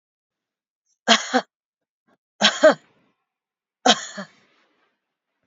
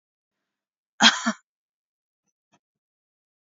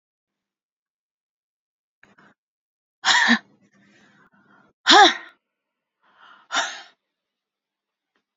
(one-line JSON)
{"three_cough_length": "5.5 s", "three_cough_amplitude": 32768, "three_cough_signal_mean_std_ratio": 0.25, "cough_length": "3.4 s", "cough_amplitude": 29178, "cough_signal_mean_std_ratio": 0.18, "exhalation_length": "8.4 s", "exhalation_amplitude": 29947, "exhalation_signal_mean_std_ratio": 0.23, "survey_phase": "beta (2021-08-13 to 2022-03-07)", "age": "45-64", "gender": "Female", "wearing_mask": "No", "symptom_none": true, "smoker_status": "Never smoked", "respiratory_condition_asthma": false, "respiratory_condition_other": false, "recruitment_source": "REACT", "submission_delay": "3 days", "covid_test_result": "Negative", "covid_test_method": "RT-qPCR", "influenza_a_test_result": "Negative", "influenza_b_test_result": "Negative"}